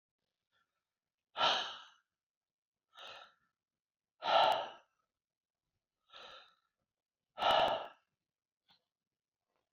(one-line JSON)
{"exhalation_length": "9.7 s", "exhalation_amplitude": 5366, "exhalation_signal_mean_std_ratio": 0.28, "survey_phase": "beta (2021-08-13 to 2022-03-07)", "age": "65+", "gender": "Male", "wearing_mask": "No", "symptom_none": true, "smoker_status": "Never smoked", "respiratory_condition_asthma": false, "respiratory_condition_other": false, "recruitment_source": "REACT", "submission_delay": "1 day", "covid_test_result": "Negative", "covid_test_method": "RT-qPCR"}